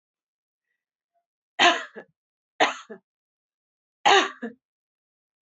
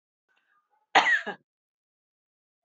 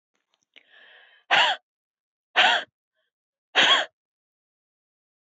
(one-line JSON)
{"three_cough_length": "5.5 s", "three_cough_amplitude": 19927, "three_cough_signal_mean_std_ratio": 0.25, "cough_length": "2.6 s", "cough_amplitude": 18903, "cough_signal_mean_std_ratio": 0.25, "exhalation_length": "5.2 s", "exhalation_amplitude": 18756, "exhalation_signal_mean_std_ratio": 0.31, "survey_phase": "beta (2021-08-13 to 2022-03-07)", "age": "65+", "gender": "Female", "wearing_mask": "No", "symptom_none": true, "smoker_status": "Never smoked", "respiratory_condition_asthma": false, "respiratory_condition_other": false, "recruitment_source": "REACT", "submission_delay": "1 day", "covid_test_result": "Negative", "covid_test_method": "RT-qPCR"}